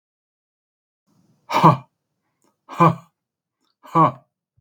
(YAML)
exhalation_length: 4.6 s
exhalation_amplitude: 32767
exhalation_signal_mean_std_ratio: 0.27
survey_phase: beta (2021-08-13 to 2022-03-07)
age: 45-64
gender: Male
wearing_mask: 'No'
symptom_none: true
smoker_status: Never smoked
respiratory_condition_asthma: false
respiratory_condition_other: false
recruitment_source: REACT
submission_delay: 3 days
covid_test_result: Negative
covid_test_method: RT-qPCR
influenza_a_test_result: Negative
influenza_b_test_result: Negative